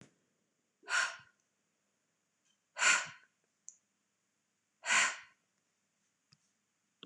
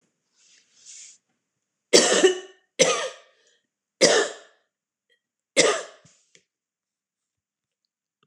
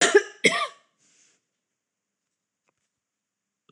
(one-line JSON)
{"exhalation_length": "7.1 s", "exhalation_amplitude": 6245, "exhalation_signal_mean_std_ratio": 0.26, "three_cough_length": "8.3 s", "three_cough_amplitude": 26028, "three_cough_signal_mean_std_ratio": 0.29, "cough_length": "3.7 s", "cough_amplitude": 21004, "cough_signal_mean_std_ratio": 0.23, "survey_phase": "beta (2021-08-13 to 2022-03-07)", "age": "45-64", "gender": "Female", "wearing_mask": "No", "symptom_loss_of_taste": true, "smoker_status": "Never smoked", "respiratory_condition_asthma": false, "respiratory_condition_other": false, "recruitment_source": "REACT", "submission_delay": "1 day", "covid_test_result": "Negative", "covid_test_method": "RT-qPCR", "influenza_a_test_result": "Negative", "influenza_b_test_result": "Negative"}